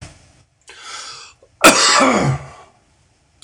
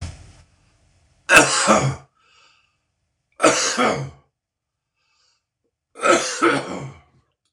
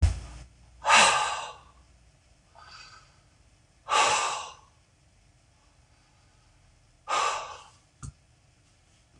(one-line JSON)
{"cough_length": "3.4 s", "cough_amplitude": 26028, "cough_signal_mean_std_ratio": 0.41, "three_cough_length": "7.5 s", "three_cough_amplitude": 26028, "three_cough_signal_mean_std_ratio": 0.39, "exhalation_length": "9.2 s", "exhalation_amplitude": 18472, "exhalation_signal_mean_std_ratio": 0.35, "survey_phase": "beta (2021-08-13 to 2022-03-07)", "age": "45-64", "gender": "Male", "wearing_mask": "No", "symptom_cough_any": true, "symptom_runny_or_blocked_nose": true, "symptom_sore_throat": true, "symptom_abdominal_pain": true, "symptom_diarrhoea": true, "symptom_fatigue": true, "symptom_headache": true, "symptom_onset": "3 days", "smoker_status": "Never smoked", "respiratory_condition_asthma": false, "respiratory_condition_other": false, "recruitment_source": "Test and Trace", "submission_delay": "1 day", "covid_test_result": "Positive", "covid_test_method": "RT-qPCR", "covid_ct_value": 15.2, "covid_ct_gene": "ORF1ab gene", "covid_ct_mean": 15.5, "covid_viral_load": "8100000 copies/ml", "covid_viral_load_category": "High viral load (>1M copies/ml)"}